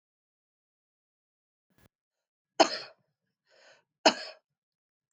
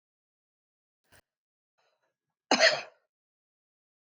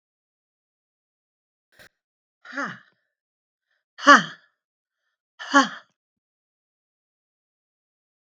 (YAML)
three_cough_length: 5.1 s
three_cough_amplitude: 13036
three_cough_signal_mean_std_ratio: 0.15
cough_length: 4.0 s
cough_amplitude: 12412
cough_signal_mean_std_ratio: 0.19
exhalation_length: 8.3 s
exhalation_amplitude: 32766
exhalation_signal_mean_std_ratio: 0.16
survey_phase: beta (2021-08-13 to 2022-03-07)
age: 45-64
gender: Female
wearing_mask: 'No'
symptom_runny_or_blocked_nose: true
smoker_status: Ex-smoker
respiratory_condition_asthma: true
respiratory_condition_other: false
recruitment_source: REACT
submission_delay: 1 day
covid_test_result: Negative
covid_test_method: RT-qPCR
influenza_a_test_result: Negative
influenza_b_test_result: Negative